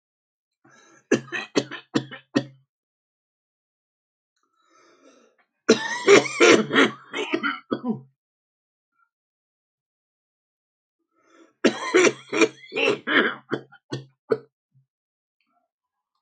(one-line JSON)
{"three_cough_length": "16.2 s", "three_cough_amplitude": 27926, "three_cough_signal_mean_std_ratio": 0.31, "survey_phase": "alpha (2021-03-01 to 2021-08-12)", "age": "65+", "gender": "Male", "wearing_mask": "No", "symptom_none": true, "smoker_status": "Ex-smoker", "respiratory_condition_asthma": true, "respiratory_condition_other": true, "recruitment_source": "REACT", "submission_delay": "2 days", "covid_test_result": "Negative", "covid_test_method": "RT-qPCR"}